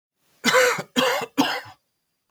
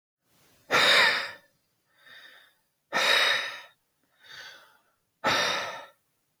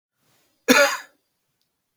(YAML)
three_cough_length: 2.3 s
three_cough_amplitude: 18557
three_cough_signal_mean_std_ratio: 0.51
exhalation_length: 6.4 s
exhalation_amplitude: 12425
exhalation_signal_mean_std_ratio: 0.42
cough_length: 2.0 s
cough_amplitude: 31844
cough_signal_mean_std_ratio: 0.29
survey_phase: beta (2021-08-13 to 2022-03-07)
age: 45-64
gender: Male
wearing_mask: 'No'
symptom_cough_any: true
symptom_runny_or_blocked_nose: true
symptom_headache: true
symptom_change_to_sense_of_smell_or_taste: true
symptom_loss_of_taste: true
symptom_onset: 4 days
smoker_status: Never smoked
respiratory_condition_asthma: false
respiratory_condition_other: false
recruitment_source: Test and Trace
submission_delay: 2 days
covid_test_result: Positive
covid_test_method: RT-qPCR
covid_ct_value: 22.4
covid_ct_gene: N gene